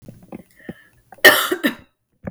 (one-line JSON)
{"cough_length": "2.3 s", "cough_amplitude": 32768, "cough_signal_mean_std_ratio": 0.31, "survey_phase": "beta (2021-08-13 to 2022-03-07)", "age": "18-44", "gender": "Female", "wearing_mask": "No", "symptom_runny_or_blocked_nose": true, "symptom_sore_throat": true, "symptom_headache": true, "smoker_status": "Never smoked", "respiratory_condition_asthma": false, "respiratory_condition_other": false, "recruitment_source": "Test and Trace", "submission_delay": "1 day", "covid_test_result": "Positive", "covid_test_method": "RT-qPCR", "covid_ct_value": 27.1, "covid_ct_gene": "ORF1ab gene"}